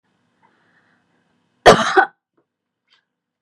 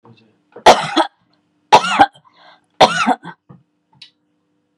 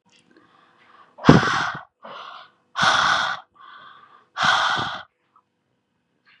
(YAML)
cough_length: 3.4 s
cough_amplitude: 32768
cough_signal_mean_std_ratio: 0.23
three_cough_length: 4.8 s
three_cough_amplitude: 32768
three_cough_signal_mean_std_ratio: 0.32
exhalation_length: 6.4 s
exhalation_amplitude: 32768
exhalation_signal_mean_std_ratio: 0.39
survey_phase: beta (2021-08-13 to 2022-03-07)
age: 18-44
gender: Female
wearing_mask: 'No'
symptom_none: true
smoker_status: Never smoked
respiratory_condition_asthma: false
respiratory_condition_other: false
recruitment_source: REACT
submission_delay: 2 days
covid_test_result: Negative
covid_test_method: RT-qPCR
influenza_a_test_result: Negative
influenza_b_test_result: Negative